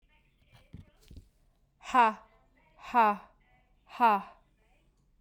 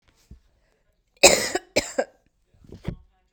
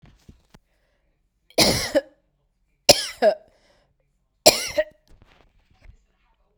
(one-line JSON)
{"exhalation_length": "5.2 s", "exhalation_amplitude": 8976, "exhalation_signal_mean_std_ratio": 0.3, "cough_length": "3.3 s", "cough_amplitude": 32767, "cough_signal_mean_std_ratio": 0.26, "three_cough_length": "6.6 s", "three_cough_amplitude": 32768, "three_cough_signal_mean_std_ratio": 0.26, "survey_phase": "beta (2021-08-13 to 2022-03-07)", "age": "18-44", "gender": "Female", "wearing_mask": "No", "symptom_cough_any": true, "symptom_runny_or_blocked_nose": true, "symptom_sore_throat": true, "symptom_fatigue": true, "symptom_fever_high_temperature": true, "symptom_headache": true, "symptom_onset": "5 days", "smoker_status": "Ex-smoker", "respiratory_condition_asthma": false, "respiratory_condition_other": false, "recruitment_source": "Test and Trace", "submission_delay": "2 days", "covid_test_result": "Positive", "covid_test_method": "RT-qPCR", "covid_ct_value": 19.6, "covid_ct_gene": "ORF1ab gene", "covid_ct_mean": 19.7, "covid_viral_load": "340000 copies/ml", "covid_viral_load_category": "Low viral load (10K-1M copies/ml)"}